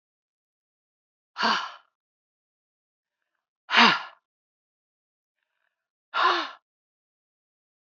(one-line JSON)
{"exhalation_length": "7.9 s", "exhalation_amplitude": 23558, "exhalation_signal_mean_std_ratio": 0.24, "survey_phase": "beta (2021-08-13 to 2022-03-07)", "age": "45-64", "gender": "Female", "wearing_mask": "No", "symptom_cough_any": true, "symptom_runny_or_blocked_nose": true, "symptom_fatigue": true, "symptom_onset": "2 days", "smoker_status": "Never smoked", "respiratory_condition_asthma": false, "respiratory_condition_other": false, "recruitment_source": "Test and Trace", "submission_delay": "2 days", "covid_test_result": "Positive", "covid_test_method": "RT-qPCR", "covid_ct_value": 15.3, "covid_ct_gene": "ORF1ab gene", "covid_ct_mean": 15.6, "covid_viral_load": "7800000 copies/ml", "covid_viral_load_category": "High viral load (>1M copies/ml)"}